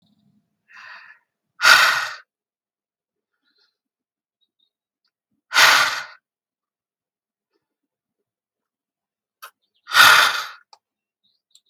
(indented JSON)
{
  "exhalation_length": "11.7 s",
  "exhalation_amplitude": 32768,
  "exhalation_signal_mean_std_ratio": 0.26,
  "survey_phase": "beta (2021-08-13 to 2022-03-07)",
  "age": "65+",
  "gender": "Female",
  "wearing_mask": "No",
  "symptom_none": true,
  "smoker_status": "Never smoked",
  "respiratory_condition_asthma": false,
  "respiratory_condition_other": false,
  "recruitment_source": "REACT",
  "submission_delay": "0 days",
  "covid_test_result": "Negative",
  "covid_test_method": "RT-qPCR",
  "influenza_a_test_result": "Negative",
  "influenza_b_test_result": "Negative"
}